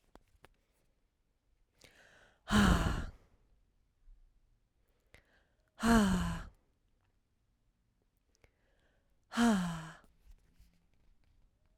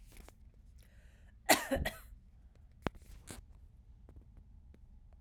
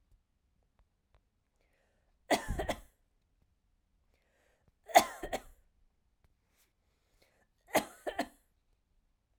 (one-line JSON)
{"exhalation_length": "11.8 s", "exhalation_amplitude": 5790, "exhalation_signal_mean_std_ratio": 0.31, "cough_length": "5.2 s", "cough_amplitude": 8195, "cough_signal_mean_std_ratio": 0.3, "three_cough_length": "9.4 s", "three_cough_amplitude": 13247, "three_cough_signal_mean_std_ratio": 0.19, "survey_phase": "beta (2021-08-13 to 2022-03-07)", "age": "18-44", "gender": "Female", "wearing_mask": "No", "symptom_none": true, "symptom_onset": "13 days", "smoker_status": "Ex-smoker", "respiratory_condition_asthma": false, "respiratory_condition_other": false, "recruitment_source": "REACT", "submission_delay": "3 days", "covid_test_result": "Negative", "covid_test_method": "RT-qPCR"}